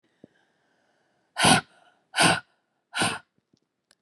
{"exhalation_length": "4.0 s", "exhalation_amplitude": 19436, "exhalation_signal_mean_std_ratio": 0.31, "survey_phase": "beta (2021-08-13 to 2022-03-07)", "age": "18-44", "gender": "Female", "wearing_mask": "No", "symptom_runny_or_blocked_nose": true, "symptom_sore_throat": true, "symptom_fatigue": true, "symptom_headache": true, "symptom_onset": "3 days", "smoker_status": "Never smoked", "respiratory_condition_asthma": false, "respiratory_condition_other": false, "recruitment_source": "Test and Trace", "submission_delay": "2 days", "covid_test_result": "Positive", "covid_test_method": "RT-qPCR", "covid_ct_value": 25.8, "covid_ct_gene": "ORF1ab gene", "covid_ct_mean": 26.1, "covid_viral_load": "2800 copies/ml", "covid_viral_load_category": "Minimal viral load (< 10K copies/ml)"}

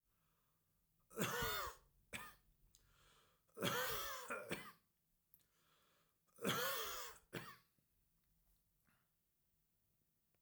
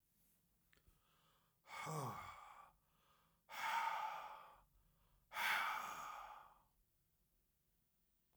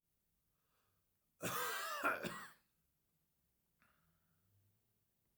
{"three_cough_length": "10.4 s", "three_cough_amplitude": 1921, "three_cough_signal_mean_std_ratio": 0.42, "exhalation_length": "8.4 s", "exhalation_amplitude": 1445, "exhalation_signal_mean_std_ratio": 0.46, "cough_length": "5.4 s", "cough_amplitude": 1987, "cough_signal_mean_std_ratio": 0.35, "survey_phase": "beta (2021-08-13 to 2022-03-07)", "age": "45-64", "gender": "Male", "wearing_mask": "No", "symptom_none": true, "smoker_status": "Never smoked", "respiratory_condition_asthma": false, "respiratory_condition_other": false, "recruitment_source": "REACT", "submission_delay": "2 days", "covid_test_result": "Negative", "covid_test_method": "RT-qPCR", "influenza_a_test_result": "Negative", "influenza_b_test_result": "Negative"}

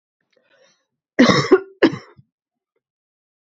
{"cough_length": "3.5 s", "cough_amplitude": 29423, "cough_signal_mean_std_ratio": 0.28, "survey_phase": "beta (2021-08-13 to 2022-03-07)", "age": "45-64", "gender": "Female", "wearing_mask": "No", "symptom_cough_any": true, "symptom_runny_or_blocked_nose": true, "symptom_sore_throat": true, "symptom_fatigue": true, "symptom_fever_high_temperature": true, "symptom_headache": true, "symptom_other": true, "symptom_onset": "3 days", "smoker_status": "Never smoked", "respiratory_condition_asthma": false, "respiratory_condition_other": false, "recruitment_source": "Test and Trace", "submission_delay": "1 day", "covid_test_result": "Positive", "covid_test_method": "RT-qPCR", "covid_ct_value": 13.3, "covid_ct_gene": "ORF1ab gene", "covid_ct_mean": 13.5, "covid_viral_load": "38000000 copies/ml", "covid_viral_load_category": "High viral load (>1M copies/ml)"}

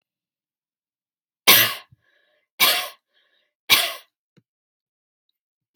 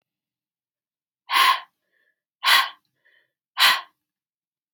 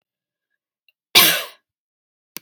{"three_cough_length": "5.8 s", "three_cough_amplitude": 32768, "three_cough_signal_mean_std_ratio": 0.26, "exhalation_length": "4.7 s", "exhalation_amplitude": 25791, "exhalation_signal_mean_std_ratio": 0.31, "cough_length": "2.4 s", "cough_amplitude": 32768, "cough_signal_mean_std_ratio": 0.25, "survey_phase": "beta (2021-08-13 to 2022-03-07)", "age": "18-44", "gender": "Female", "wearing_mask": "No", "symptom_none": true, "smoker_status": "Ex-smoker", "respiratory_condition_asthma": false, "respiratory_condition_other": false, "recruitment_source": "REACT", "submission_delay": "0 days", "covid_test_result": "Negative", "covid_test_method": "RT-qPCR", "influenza_a_test_result": "Negative", "influenza_b_test_result": "Negative"}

